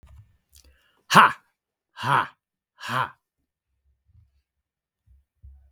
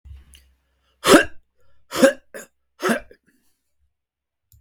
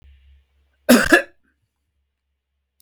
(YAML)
exhalation_length: 5.7 s
exhalation_amplitude: 32768
exhalation_signal_mean_std_ratio: 0.22
three_cough_length: 4.6 s
three_cough_amplitude: 32768
three_cough_signal_mean_std_ratio: 0.26
cough_length: 2.8 s
cough_amplitude: 32768
cough_signal_mean_std_ratio: 0.25
survey_phase: beta (2021-08-13 to 2022-03-07)
age: 45-64
gender: Male
wearing_mask: 'No'
symptom_none: true
smoker_status: Never smoked
respiratory_condition_asthma: false
respiratory_condition_other: false
recruitment_source: REACT
submission_delay: 2 days
covid_test_result: Negative
covid_test_method: RT-qPCR